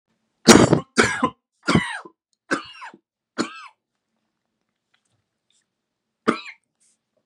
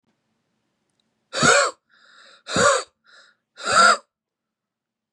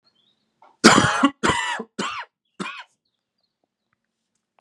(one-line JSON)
{"three_cough_length": "7.3 s", "three_cough_amplitude": 32768, "three_cough_signal_mean_std_ratio": 0.26, "exhalation_length": "5.1 s", "exhalation_amplitude": 25892, "exhalation_signal_mean_std_ratio": 0.35, "cough_length": "4.6 s", "cough_amplitude": 32768, "cough_signal_mean_std_ratio": 0.33, "survey_phase": "beta (2021-08-13 to 2022-03-07)", "age": "18-44", "gender": "Male", "wearing_mask": "No", "symptom_cough_any": true, "symptom_runny_or_blocked_nose": true, "symptom_sore_throat": true, "symptom_fatigue": true, "symptom_headache": true, "symptom_other": true, "symptom_onset": "3 days", "smoker_status": "Current smoker (e-cigarettes or vapes only)", "respiratory_condition_asthma": false, "respiratory_condition_other": false, "recruitment_source": "Test and Trace", "submission_delay": "0 days", "covid_test_result": "Positive", "covid_test_method": "RT-qPCR", "covid_ct_value": 20.6, "covid_ct_gene": "N gene", "covid_ct_mean": 21.2, "covid_viral_load": "110000 copies/ml", "covid_viral_load_category": "Low viral load (10K-1M copies/ml)"}